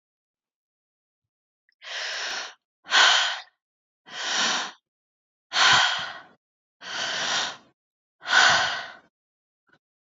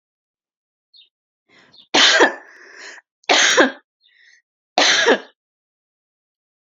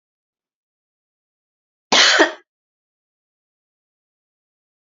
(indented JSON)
{
  "exhalation_length": "10.1 s",
  "exhalation_amplitude": 20016,
  "exhalation_signal_mean_std_ratio": 0.42,
  "three_cough_length": "6.7 s",
  "three_cough_amplitude": 32471,
  "three_cough_signal_mean_std_ratio": 0.35,
  "cough_length": "4.9 s",
  "cough_amplitude": 32767,
  "cough_signal_mean_std_ratio": 0.22,
  "survey_phase": "beta (2021-08-13 to 2022-03-07)",
  "age": "18-44",
  "gender": "Female",
  "wearing_mask": "No",
  "symptom_shortness_of_breath": true,
  "symptom_sore_throat": true,
  "symptom_fever_high_temperature": true,
  "symptom_other": true,
  "smoker_status": "Never smoked",
  "respiratory_condition_asthma": false,
  "respiratory_condition_other": false,
  "recruitment_source": "Test and Trace",
  "submission_delay": "1 day",
  "covid_test_result": "Positive",
  "covid_test_method": "RT-qPCR",
  "covid_ct_value": 31.8,
  "covid_ct_gene": "ORF1ab gene"
}